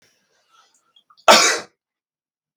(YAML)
cough_length: 2.6 s
cough_amplitude: 32768
cough_signal_mean_std_ratio: 0.26
survey_phase: beta (2021-08-13 to 2022-03-07)
age: 45-64
gender: Male
wearing_mask: 'No'
symptom_none: true
smoker_status: Never smoked
respiratory_condition_asthma: false
respiratory_condition_other: false
recruitment_source: REACT
submission_delay: 3 days
covid_test_result: Negative
covid_test_method: RT-qPCR
influenza_a_test_result: Unknown/Void
influenza_b_test_result: Unknown/Void